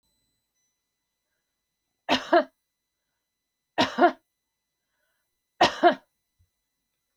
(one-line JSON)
{"three_cough_length": "7.2 s", "three_cough_amplitude": 18351, "three_cough_signal_mean_std_ratio": 0.23, "survey_phase": "beta (2021-08-13 to 2022-03-07)", "age": "45-64", "gender": "Female", "wearing_mask": "No", "symptom_none": true, "smoker_status": "Never smoked", "respiratory_condition_asthma": false, "respiratory_condition_other": false, "recruitment_source": "REACT", "submission_delay": "1 day", "covid_test_result": "Negative", "covid_test_method": "RT-qPCR", "influenza_a_test_result": "Negative", "influenza_b_test_result": "Negative"}